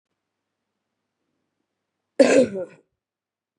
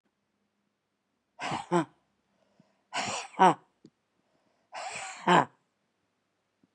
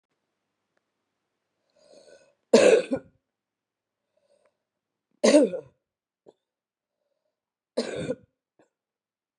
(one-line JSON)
{"cough_length": "3.6 s", "cough_amplitude": 26753, "cough_signal_mean_std_ratio": 0.23, "exhalation_length": "6.7 s", "exhalation_amplitude": 15222, "exhalation_signal_mean_std_ratio": 0.26, "three_cough_length": "9.4 s", "three_cough_amplitude": 21241, "three_cough_signal_mean_std_ratio": 0.23, "survey_phase": "beta (2021-08-13 to 2022-03-07)", "age": "45-64", "gender": "Female", "wearing_mask": "Yes", "symptom_cough_any": true, "symptom_runny_or_blocked_nose": true, "symptom_sore_throat": true, "symptom_fatigue": true, "symptom_headache": true, "symptom_onset": "3 days", "smoker_status": "Never smoked", "respiratory_condition_asthma": false, "respiratory_condition_other": false, "recruitment_source": "Test and Trace", "submission_delay": "1 day", "covid_test_result": "Positive", "covid_test_method": "RT-qPCR", "covid_ct_value": 24.3, "covid_ct_gene": "N gene"}